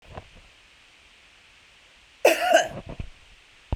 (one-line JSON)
{"cough_length": "3.8 s", "cough_amplitude": 19428, "cough_signal_mean_std_ratio": 0.31, "survey_phase": "beta (2021-08-13 to 2022-03-07)", "age": "45-64", "gender": "Female", "wearing_mask": "No", "symptom_sore_throat": true, "symptom_fatigue": true, "symptom_onset": "13 days", "smoker_status": "Ex-smoker", "respiratory_condition_asthma": false, "respiratory_condition_other": false, "recruitment_source": "REACT", "submission_delay": "3 days", "covid_test_result": "Negative", "covid_test_method": "RT-qPCR"}